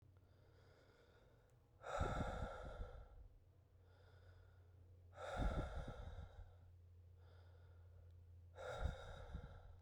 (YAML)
exhalation_length: 9.8 s
exhalation_amplitude: 1182
exhalation_signal_mean_std_ratio: 0.57
survey_phase: beta (2021-08-13 to 2022-03-07)
age: 18-44
gender: Male
wearing_mask: 'No'
symptom_cough_any: true
symptom_new_continuous_cough: true
symptom_runny_or_blocked_nose: true
symptom_shortness_of_breath: true
symptom_sore_throat: true
symptom_fatigue: true
symptom_fever_high_temperature: true
symptom_headache: true
symptom_onset: 6 days
smoker_status: Never smoked
respiratory_condition_asthma: false
respiratory_condition_other: false
recruitment_source: Test and Trace
submission_delay: 2 days
covid_test_result: Positive
covid_test_method: RT-qPCR